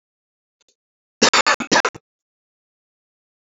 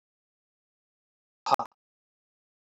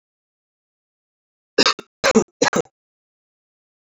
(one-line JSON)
{"cough_length": "3.4 s", "cough_amplitude": 31338, "cough_signal_mean_std_ratio": 0.27, "exhalation_length": "2.6 s", "exhalation_amplitude": 15599, "exhalation_signal_mean_std_ratio": 0.14, "three_cough_length": "3.9 s", "three_cough_amplitude": 30222, "three_cough_signal_mean_std_ratio": 0.25, "survey_phase": "alpha (2021-03-01 to 2021-08-12)", "age": "45-64", "gender": "Male", "wearing_mask": "No", "symptom_cough_any": true, "symptom_shortness_of_breath": true, "symptom_fatigue": true, "symptom_fever_high_temperature": true, "symptom_headache": true, "symptom_onset": "3 days", "smoker_status": "Never smoked", "respiratory_condition_asthma": false, "respiratory_condition_other": false, "recruitment_source": "Test and Trace", "submission_delay": "1 day", "covid_test_result": "Positive", "covid_test_method": "RT-qPCR", "covid_ct_value": 23.3, "covid_ct_gene": "ORF1ab gene", "covid_ct_mean": 24.3, "covid_viral_load": "11000 copies/ml", "covid_viral_load_category": "Low viral load (10K-1M copies/ml)"}